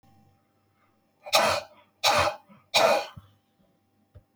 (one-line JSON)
{"exhalation_length": "4.4 s", "exhalation_amplitude": 21467, "exhalation_signal_mean_std_ratio": 0.38, "survey_phase": "beta (2021-08-13 to 2022-03-07)", "age": "45-64", "gender": "Male", "wearing_mask": "No", "symptom_cough_any": true, "symptom_runny_or_blocked_nose": true, "smoker_status": "Ex-smoker", "respiratory_condition_asthma": false, "respiratory_condition_other": false, "recruitment_source": "REACT", "submission_delay": "2 days", "covid_test_result": "Negative", "covid_test_method": "RT-qPCR"}